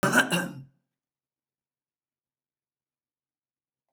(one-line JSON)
{"cough_length": "3.9 s", "cough_amplitude": 16377, "cough_signal_mean_std_ratio": 0.25, "survey_phase": "beta (2021-08-13 to 2022-03-07)", "age": "65+", "gender": "Female", "wearing_mask": "No", "symptom_other": true, "symptom_onset": "12 days", "smoker_status": "Never smoked", "respiratory_condition_asthma": false, "respiratory_condition_other": false, "recruitment_source": "REACT", "submission_delay": "3 days", "covid_test_result": "Negative", "covid_test_method": "RT-qPCR"}